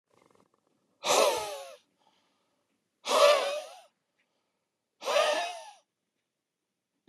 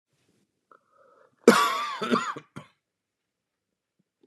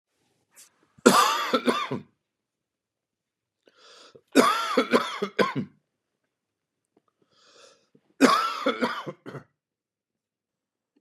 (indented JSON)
{
  "exhalation_length": "7.1 s",
  "exhalation_amplitude": 11361,
  "exhalation_signal_mean_std_ratio": 0.36,
  "cough_length": "4.3 s",
  "cough_amplitude": 26485,
  "cough_signal_mean_std_ratio": 0.27,
  "three_cough_length": "11.0 s",
  "three_cough_amplitude": 31478,
  "three_cough_signal_mean_std_ratio": 0.35,
  "survey_phase": "beta (2021-08-13 to 2022-03-07)",
  "age": "45-64",
  "gender": "Male",
  "wearing_mask": "No",
  "symptom_cough_any": true,
  "symptom_shortness_of_breath": true,
  "symptom_sore_throat": true,
  "symptom_fatigue": true,
  "symptom_headache": true,
  "symptom_onset": "5 days",
  "smoker_status": "Never smoked",
  "respiratory_condition_asthma": false,
  "respiratory_condition_other": false,
  "recruitment_source": "Test and Trace",
  "submission_delay": "1 day",
  "covid_test_result": "Positive",
  "covid_test_method": "RT-qPCR",
  "covid_ct_value": 28.0,
  "covid_ct_gene": "ORF1ab gene",
  "covid_ct_mean": 28.9,
  "covid_viral_load": "320 copies/ml",
  "covid_viral_load_category": "Minimal viral load (< 10K copies/ml)"
}